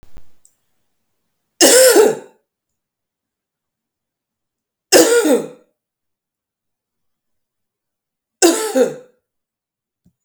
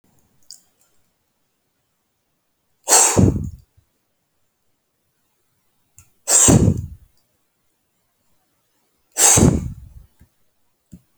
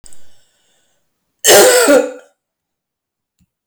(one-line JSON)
{"three_cough_length": "10.2 s", "three_cough_amplitude": 32768, "three_cough_signal_mean_std_ratio": 0.31, "exhalation_length": "11.2 s", "exhalation_amplitude": 32768, "exhalation_signal_mean_std_ratio": 0.29, "cough_length": "3.7 s", "cough_amplitude": 32768, "cough_signal_mean_std_ratio": 0.38, "survey_phase": "beta (2021-08-13 to 2022-03-07)", "age": "45-64", "gender": "Female", "wearing_mask": "No", "symptom_none": true, "smoker_status": "Ex-smoker", "respiratory_condition_asthma": true, "respiratory_condition_other": false, "recruitment_source": "REACT", "submission_delay": "1 day", "covid_test_result": "Negative", "covid_test_method": "RT-qPCR"}